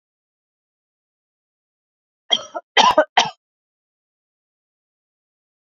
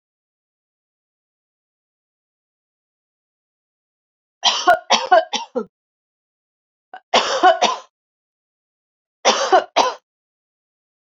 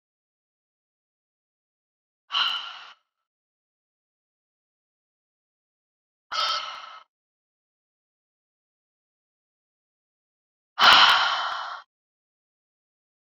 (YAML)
cough_length: 5.6 s
cough_amplitude: 30283
cough_signal_mean_std_ratio: 0.21
three_cough_length: 11.1 s
three_cough_amplitude: 28951
three_cough_signal_mean_std_ratio: 0.29
exhalation_length: 13.3 s
exhalation_amplitude: 25387
exhalation_signal_mean_std_ratio: 0.23
survey_phase: beta (2021-08-13 to 2022-03-07)
age: 18-44
gender: Female
wearing_mask: 'No'
symptom_none: true
smoker_status: Ex-smoker
respiratory_condition_asthma: false
respiratory_condition_other: false
recruitment_source: REACT
submission_delay: 1 day
covid_test_result: Negative
covid_test_method: RT-qPCR